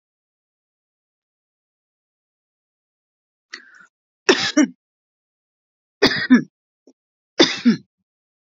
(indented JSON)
{
  "three_cough_length": "8.5 s",
  "three_cough_amplitude": 32768,
  "three_cough_signal_mean_std_ratio": 0.24,
  "survey_phase": "beta (2021-08-13 to 2022-03-07)",
  "age": "45-64",
  "gender": "Female",
  "wearing_mask": "No",
  "symptom_fatigue": true,
  "smoker_status": "Never smoked",
  "respiratory_condition_asthma": true,
  "respiratory_condition_other": false,
  "recruitment_source": "REACT",
  "submission_delay": "4 days",
  "covid_test_result": "Negative",
  "covid_test_method": "RT-qPCR",
  "influenza_a_test_result": "Negative",
  "influenza_b_test_result": "Negative"
}